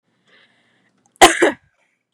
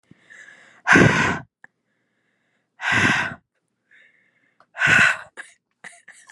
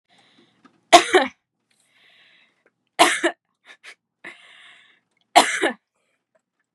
{"cough_length": "2.1 s", "cough_amplitude": 32768, "cough_signal_mean_std_ratio": 0.25, "exhalation_length": "6.3 s", "exhalation_amplitude": 31188, "exhalation_signal_mean_std_ratio": 0.37, "three_cough_length": "6.7 s", "three_cough_amplitude": 32768, "three_cough_signal_mean_std_ratio": 0.25, "survey_phase": "beta (2021-08-13 to 2022-03-07)", "age": "18-44", "gender": "Female", "wearing_mask": "No", "symptom_none": true, "symptom_onset": "13 days", "smoker_status": "Never smoked", "respiratory_condition_asthma": false, "respiratory_condition_other": false, "recruitment_source": "REACT", "submission_delay": "2 days", "covid_test_result": "Negative", "covid_test_method": "RT-qPCR", "influenza_a_test_result": "Negative", "influenza_b_test_result": "Negative"}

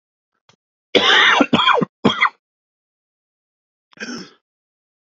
{"cough_length": "5.0 s", "cough_amplitude": 29115, "cough_signal_mean_std_ratio": 0.38, "survey_phase": "beta (2021-08-13 to 2022-03-07)", "age": "18-44", "gender": "Male", "wearing_mask": "No", "symptom_cough_any": true, "symptom_new_continuous_cough": true, "symptom_runny_or_blocked_nose": true, "symptom_shortness_of_breath": true, "symptom_sore_throat": true, "symptom_fatigue": true, "symptom_change_to_sense_of_smell_or_taste": true, "symptom_onset": "4 days", "smoker_status": "Never smoked", "respiratory_condition_asthma": false, "respiratory_condition_other": false, "recruitment_source": "Test and Trace", "submission_delay": "2 days", "covid_test_result": "Positive", "covid_test_method": "RT-qPCR"}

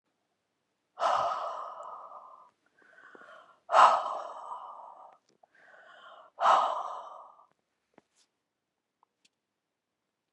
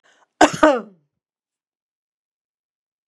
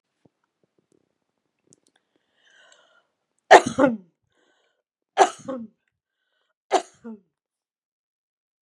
{"exhalation_length": "10.3 s", "exhalation_amplitude": 16865, "exhalation_signal_mean_std_ratio": 0.31, "cough_length": "3.1 s", "cough_amplitude": 32767, "cough_signal_mean_std_ratio": 0.22, "three_cough_length": "8.6 s", "three_cough_amplitude": 32768, "three_cough_signal_mean_std_ratio": 0.18, "survey_phase": "beta (2021-08-13 to 2022-03-07)", "age": "65+", "gender": "Female", "wearing_mask": "No", "symptom_none": true, "symptom_onset": "10 days", "smoker_status": "Never smoked", "respiratory_condition_asthma": false, "respiratory_condition_other": false, "recruitment_source": "REACT", "submission_delay": "1 day", "covid_test_result": "Negative", "covid_test_method": "RT-qPCR", "influenza_a_test_result": "Negative", "influenza_b_test_result": "Negative"}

